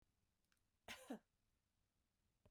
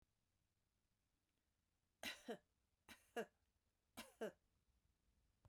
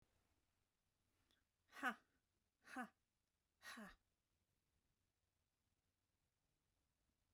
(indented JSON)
{
  "cough_length": "2.5 s",
  "cough_amplitude": 326,
  "cough_signal_mean_std_ratio": 0.28,
  "three_cough_length": "5.5 s",
  "three_cough_amplitude": 626,
  "three_cough_signal_mean_std_ratio": 0.26,
  "exhalation_length": "7.3 s",
  "exhalation_amplitude": 896,
  "exhalation_signal_mean_std_ratio": 0.21,
  "survey_phase": "beta (2021-08-13 to 2022-03-07)",
  "age": "65+",
  "gender": "Female",
  "wearing_mask": "No",
  "symptom_none": true,
  "smoker_status": "Never smoked",
  "respiratory_condition_asthma": false,
  "respiratory_condition_other": false,
  "recruitment_source": "REACT",
  "submission_delay": "1 day",
  "covid_test_result": "Negative",
  "covid_test_method": "RT-qPCR",
  "influenza_a_test_result": "Negative",
  "influenza_b_test_result": "Negative"
}